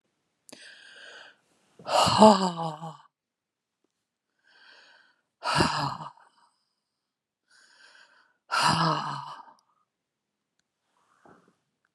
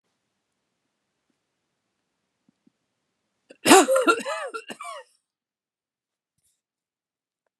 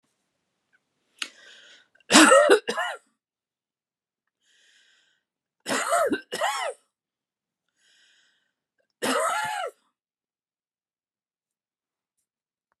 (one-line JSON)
{"exhalation_length": "11.9 s", "exhalation_amplitude": 27022, "exhalation_signal_mean_std_ratio": 0.29, "cough_length": "7.6 s", "cough_amplitude": 32536, "cough_signal_mean_std_ratio": 0.22, "three_cough_length": "12.8 s", "three_cough_amplitude": 28801, "three_cough_signal_mean_std_ratio": 0.28, "survey_phase": "beta (2021-08-13 to 2022-03-07)", "age": "65+", "gender": "Female", "wearing_mask": "No", "symptom_none": true, "smoker_status": "Ex-smoker", "respiratory_condition_asthma": false, "respiratory_condition_other": false, "recruitment_source": "REACT", "submission_delay": "2 days", "covid_test_result": "Negative", "covid_test_method": "RT-qPCR", "influenza_a_test_result": "Negative", "influenza_b_test_result": "Negative"}